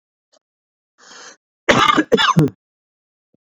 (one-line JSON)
{"cough_length": "3.4 s", "cough_amplitude": 29044, "cough_signal_mean_std_ratio": 0.36, "survey_phase": "beta (2021-08-13 to 2022-03-07)", "age": "18-44", "gender": "Male", "wearing_mask": "No", "symptom_none": true, "symptom_onset": "4 days", "smoker_status": "Never smoked", "respiratory_condition_asthma": false, "respiratory_condition_other": false, "recruitment_source": "REACT", "submission_delay": "1 day", "covid_test_result": "Negative", "covid_test_method": "RT-qPCR"}